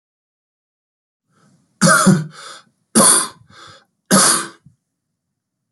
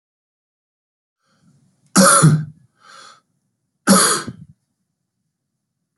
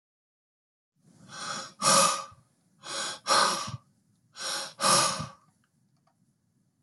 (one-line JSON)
{"three_cough_length": "5.7 s", "three_cough_amplitude": 32768, "three_cough_signal_mean_std_ratio": 0.36, "cough_length": "6.0 s", "cough_amplitude": 32768, "cough_signal_mean_std_ratio": 0.31, "exhalation_length": "6.8 s", "exhalation_amplitude": 12302, "exhalation_signal_mean_std_ratio": 0.41, "survey_phase": "beta (2021-08-13 to 2022-03-07)", "age": "45-64", "gender": "Male", "wearing_mask": "No", "symptom_cough_any": true, "symptom_runny_or_blocked_nose": true, "symptom_fatigue": true, "symptom_onset": "3 days", "smoker_status": "Ex-smoker", "respiratory_condition_asthma": false, "respiratory_condition_other": false, "recruitment_source": "Test and Trace", "submission_delay": "1 day", "covid_test_result": "Positive", "covid_test_method": "RT-qPCR", "covid_ct_value": 14.7, "covid_ct_gene": "N gene", "covid_ct_mean": 15.5, "covid_viral_load": "8400000 copies/ml", "covid_viral_load_category": "High viral load (>1M copies/ml)"}